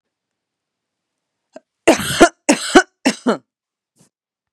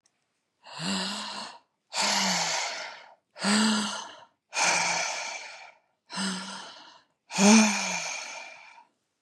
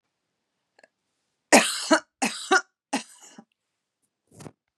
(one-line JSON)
{"cough_length": "4.5 s", "cough_amplitude": 32768, "cough_signal_mean_std_ratio": 0.28, "exhalation_length": "9.2 s", "exhalation_amplitude": 17335, "exhalation_signal_mean_std_ratio": 0.54, "three_cough_length": "4.8 s", "three_cough_amplitude": 30844, "three_cough_signal_mean_std_ratio": 0.26, "survey_phase": "beta (2021-08-13 to 2022-03-07)", "age": "18-44", "gender": "Female", "wearing_mask": "No", "symptom_runny_or_blocked_nose": true, "symptom_sore_throat": true, "symptom_abdominal_pain": true, "symptom_diarrhoea": true, "symptom_headache": true, "smoker_status": "Never smoked", "respiratory_condition_asthma": false, "respiratory_condition_other": false, "recruitment_source": "Test and Trace", "submission_delay": "2 days", "covid_test_result": "Positive", "covid_test_method": "RT-qPCR", "covid_ct_value": 25.9, "covid_ct_gene": "ORF1ab gene"}